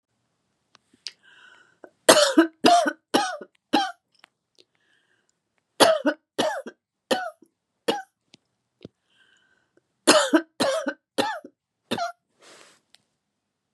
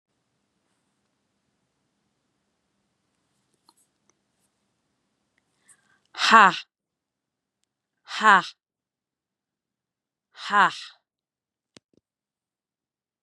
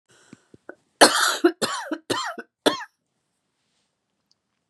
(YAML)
three_cough_length: 13.7 s
three_cough_amplitude: 31663
three_cough_signal_mean_std_ratio: 0.32
exhalation_length: 13.2 s
exhalation_amplitude: 30828
exhalation_signal_mean_std_ratio: 0.17
cough_length: 4.7 s
cough_amplitude: 32767
cough_signal_mean_std_ratio: 0.31
survey_phase: beta (2021-08-13 to 2022-03-07)
age: 45-64
gender: Female
wearing_mask: 'No'
symptom_none: true
symptom_onset: 12 days
smoker_status: Never smoked
respiratory_condition_asthma: false
respiratory_condition_other: false
recruitment_source: REACT
submission_delay: 2 days
covid_test_result: Negative
covid_test_method: RT-qPCR
influenza_a_test_result: Negative
influenza_b_test_result: Negative